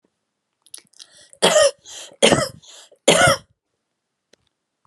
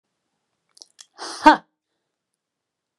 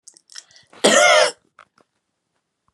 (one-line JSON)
{"three_cough_length": "4.9 s", "three_cough_amplitude": 31993, "three_cough_signal_mean_std_ratio": 0.34, "exhalation_length": "3.0 s", "exhalation_amplitude": 32767, "exhalation_signal_mean_std_ratio": 0.16, "cough_length": "2.7 s", "cough_amplitude": 32191, "cough_signal_mean_std_ratio": 0.35, "survey_phase": "beta (2021-08-13 to 2022-03-07)", "age": "45-64", "gender": "Female", "wearing_mask": "No", "symptom_none": true, "symptom_onset": "8 days", "smoker_status": "Current smoker (1 to 10 cigarettes per day)", "respiratory_condition_asthma": false, "respiratory_condition_other": false, "recruitment_source": "REACT", "submission_delay": "1 day", "covid_test_result": "Negative", "covid_test_method": "RT-qPCR"}